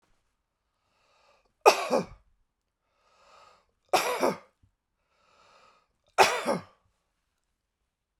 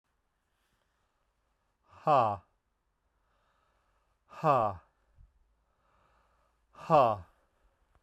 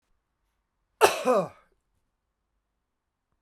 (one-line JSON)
{"three_cough_length": "8.2 s", "three_cough_amplitude": 26524, "three_cough_signal_mean_std_ratio": 0.25, "exhalation_length": "8.0 s", "exhalation_amplitude": 9371, "exhalation_signal_mean_std_ratio": 0.26, "cough_length": "3.4 s", "cough_amplitude": 28921, "cough_signal_mean_std_ratio": 0.24, "survey_phase": "beta (2021-08-13 to 2022-03-07)", "age": "45-64", "gender": "Male", "wearing_mask": "No", "symptom_cough_any": true, "symptom_new_continuous_cough": true, "symptom_runny_or_blocked_nose": true, "symptom_fatigue": true, "symptom_onset": "3 days", "smoker_status": "Never smoked", "respiratory_condition_asthma": false, "respiratory_condition_other": false, "recruitment_source": "Test and Trace", "submission_delay": "2 days", "covid_test_result": "Positive", "covid_test_method": "RT-qPCR", "covid_ct_value": 18.6, "covid_ct_gene": "N gene"}